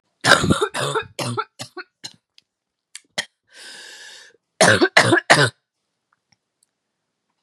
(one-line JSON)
{"cough_length": "7.4 s", "cough_amplitude": 32768, "cough_signal_mean_std_ratio": 0.35, "survey_phase": "beta (2021-08-13 to 2022-03-07)", "age": "18-44", "gender": "Female", "wearing_mask": "No", "symptom_cough_any": true, "symptom_new_continuous_cough": true, "symptom_shortness_of_breath": true, "symptom_fatigue": true, "symptom_headache": true, "symptom_onset": "3 days", "smoker_status": "Never smoked", "respiratory_condition_asthma": false, "respiratory_condition_other": false, "recruitment_source": "Test and Trace", "submission_delay": "2 days", "covid_test_result": "Positive", "covid_test_method": "RT-qPCR", "covid_ct_value": 15.7, "covid_ct_gene": "ORF1ab gene"}